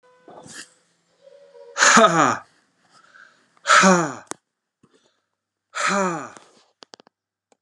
{"exhalation_length": "7.6 s", "exhalation_amplitude": 32264, "exhalation_signal_mean_std_ratio": 0.34, "survey_phase": "alpha (2021-03-01 to 2021-08-12)", "age": "45-64", "gender": "Male", "wearing_mask": "No", "symptom_change_to_sense_of_smell_or_taste": true, "smoker_status": "Never smoked", "respiratory_condition_asthma": false, "respiratory_condition_other": false, "recruitment_source": "REACT", "submission_delay": "2 days", "covid_test_result": "Negative", "covid_test_method": "RT-qPCR"}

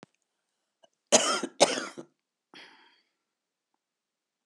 {"cough_length": "4.5 s", "cough_amplitude": 18859, "cough_signal_mean_std_ratio": 0.24, "survey_phase": "beta (2021-08-13 to 2022-03-07)", "age": "65+", "gender": "Female", "wearing_mask": "No", "symptom_shortness_of_breath": true, "symptom_fatigue": true, "symptom_headache": true, "symptom_change_to_sense_of_smell_or_taste": true, "symptom_other": true, "smoker_status": "Ex-smoker", "respiratory_condition_asthma": true, "respiratory_condition_other": true, "recruitment_source": "Test and Trace", "submission_delay": "2 days", "covid_test_result": "Positive", "covid_test_method": "LAMP"}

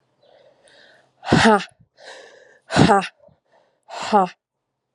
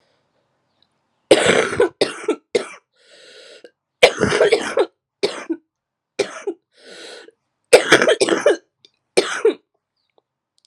{"exhalation_length": "4.9 s", "exhalation_amplitude": 32768, "exhalation_signal_mean_std_ratio": 0.33, "three_cough_length": "10.7 s", "three_cough_amplitude": 32768, "three_cough_signal_mean_std_ratio": 0.38, "survey_phase": "alpha (2021-03-01 to 2021-08-12)", "age": "18-44", "gender": "Female", "wearing_mask": "No", "symptom_cough_any": true, "symptom_shortness_of_breath": true, "symptom_fatigue": true, "symptom_headache": true, "symptom_change_to_sense_of_smell_or_taste": true, "symptom_loss_of_taste": true, "symptom_onset": "4 days", "smoker_status": "Current smoker (1 to 10 cigarettes per day)", "respiratory_condition_asthma": true, "respiratory_condition_other": false, "recruitment_source": "Test and Trace", "submission_delay": "2 days", "covid_test_result": "Positive", "covid_test_method": "RT-qPCR", "covid_ct_value": 26.2, "covid_ct_gene": "ORF1ab gene", "covid_ct_mean": 26.2, "covid_viral_load": "2500 copies/ml", "covid_viral_load_category": "Minimal viral load (< 10K copies/ml)"}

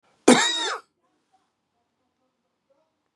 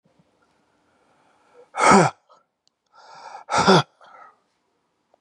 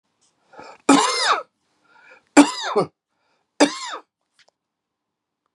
{"cough_length": "3.2 s", "cough_amplitude": 32150, "cough_signal_mean_std_ratio": 0.25, "exhalation_length": "5.2 s", "exhalation_amplitude": 30440, "exhalation_signal_mean_std_ratio": 0.28, "three_cough_length": "5.5 s", "three_cough_amplitude": 32768, "three_cough_signal_mean_std_ratio": 0.31, "survey_phase": "beta (2021-08-13 to 2022-03-07)", "age": "45-64", "gender": "Male", "wearing_mask": "No", "symptom_cough_any": true, "symptom_fatigue": true, "symptom_headache": true, "symptom_onset": "5 days", "smoker_status": "Never smoked", "respiratory_condition_asthma": false, "respiratory_condition_other": false, "recruitment_source": "REACT", "submission_delay": "3 days", "covid_test_result": "Positive", "covid_test_method": "RT-qPCR", "covid_ct_value": 20.0, "covid_ct_gene": "E gene", "influenza_a_test_result": "Negative", "influenza_b_test_result": "Negative"}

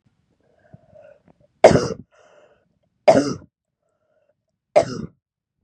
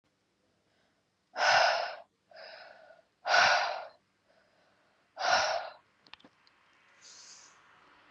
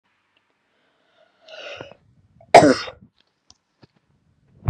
{"three_cough_length": "5.6 s", "three_cough_amplitude": 32768, "three_cough_signal_mean_std_ratio": 0.24, "exhalation_length": "8.1 s", "exhalation_amplitude": 8374, "exhalation_signal_mean_std_ratio": 0.37, "cough_length": "4.7 s", "cough_amplitude": 32768, "cough_signal_mean_std_ratio": 0.19, "survey_phase": "beta (2021-08-13 to 2022-03-07)", "age": "18-44", "gender": "Female", "wearing_mask": "No", "symptom_abdominal_pain": true, "smoker_status": "Never smoked", "respiratory_condition_asthma": false, "respiratory_condition_other": false, "recruitment_source": "REACT", "submission_delay": "5 days", "covid_test_result": "Negative", "covid_test_method": "RT-qPCR", "influenza_a_test_result": "Negative", "influenza_b_test_result": "Negative"}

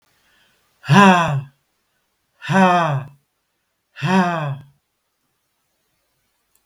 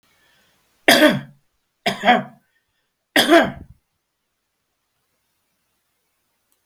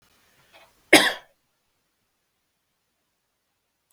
{"exhalation_length": "6.7 s", "exhalation_amplitude": 32768, "exhalation_signal_mean_std_ratio": 0.38, "three_cough_length": "6.7 s", "three_cough_amplitude": 32768, "three_cough_signal_mean_std_ratio": 0.29, "cough_length": "3.9 s", "cough_amplitude": 32768, "cough_signal_mean_std_ratio": 0.16, "survey_phase": "beta (2021-08-13 to 2022-03-07)", "age": "65+", "gender": "Male", "wearing_mask": "No", "symptom_none": true, "smoker_status": "Ex-smoker", "respiratory_condition_asthma": false, "respiratory_condition_other": false, "recruitment_source": "REACT", "submission_delay": "1 day", "covid_test_result": "Negative", "covid_test_method": "RT-qPCR", "influenza_a_test_result": "Negative", "influenza_b_test_result": "Negative"}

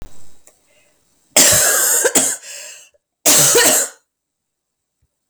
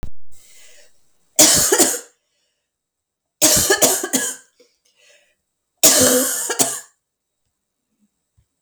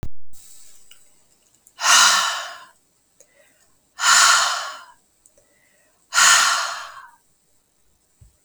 {"cough_length": "5.3 s", "cough_amplitude": 32768, "cough_signal_mean_std_ratio": 0.51, "three_cough_length": "8.6 s", "three_cough_amplitude": 32768, "three_cough_signal_mean_std_ratio": 0.43, "exhalation_length": "8.4 s", "exhalation_amplitude": 31449, "exhalation_signal_mean_std_ratio": 0.43, "survey_phase": "beta (2021-08-13 to 2022-03-07)", "age": "45-64", "gender": "Female", "wearing_mask": "No", "symptom_cough_any": true, "symptom_runny_or_blocked_nose": true, "symptom_shortness_of_breath": true, "symptom_fatigue": true, "symptom_onset": "5 days", "smoker_status": "Never smoked", "respiratory_condition_asthma": false, "respiratory_condition_other": false, "recruitment_source": "Test and Trace", "submission_delay": "1 day", "covid_test_result": "Positive", "covid_test_method": "RT-qPCR", "covid_ct_value": 19.6, "covid_ct_gene": "ORF1ab gene"}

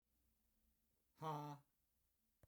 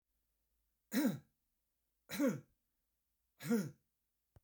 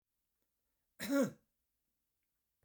{"exhalation_length": "2.5 s", "exhalation_amplitude": 452, "exhalation_signal_mean_std_ratio": 0.35, "three_cough_length": "4.4 s", "three_cough_amplitude": 2193, "three_cough_signal_mean_std_ratio": 0.34, "cough_length": "2.6 s", "cough_amplitude": 2741, "cough_signal_mean_std_ratio": 0.25, "survey_phase": "beta (2021-08-13 to 2022-03-07)", "age": "65+", "gender": "Male", "wearing_mask": "No", "symptom_none": true, "smoker_status": "Never smoked", "respiratory_condition_asthma": false, "respiratory_condition_other": false, "recruitment_source": "REACT", "submission_delay": "2 days", "covid_test_result": "Negative", "covid_test_method": "RT-qPCR", "influenza_a_test_result": "Negative", "influenza_b_test_result": "Negative"}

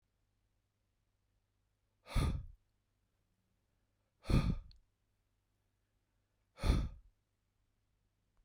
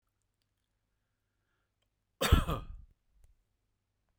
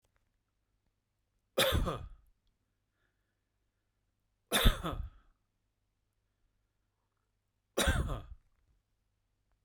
{"exhalation_length": "8.4 s", "exhalation_amplitude": 4753, "exhalation_signal_mean_std_ratio": 0.26, "cough_length": "4.2 s", "cough_amplitude": 9132, "cough_signal_mean_std_ratio": 0.21, "three_cough_length": "9.6 s", "three_cough_amplitude": 8548, "three_cough_signal_mean_std_ratio": 0.27, "survey_phase": "beta (2021-08-13 to 2022-03-07)", "age": "45-64", "gender": "Male", "wearing_mask": "No", "symptom_none": true, "smoker_status": "Never smoked", "respiratory_condition_asthma": false, "respiratory_condition_other": false, "recruitment_source": "REACT", "submission_delay": "1 day", "covid_test_result": "Negative", "covid_test_method": "RT-qPCR"}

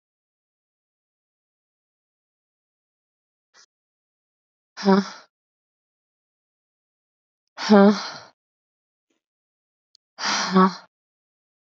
{"exhalation_length": "11.8 s", "exhalation_amplitude": 23031, "exhalation_signal_mean_std_ratio": 0.22, "survey_phase": "beta (2021-08-13 to 2022-03-07)", "age": "18-44", "gender": "Female", "wearing_mask": "No", "symptom_new_continuous_cough": true, "symptom_runny_or_blocked_nose": true, "symptom_sore_throat": true, "symptom_fatigue": true, "symptom_fever_high_temperature": true, "symptom_headache": true, "symptom_onset": "3 days", "smoker_status": "Ex-smoker", "respiratory_condition_asthma": false, "respiratory_condition_other": false, "recruitment_source": "Test and Trace", "submission_delay": "1 day", "covid_test_result": "Positive", "covid_test_method": "ePCR"}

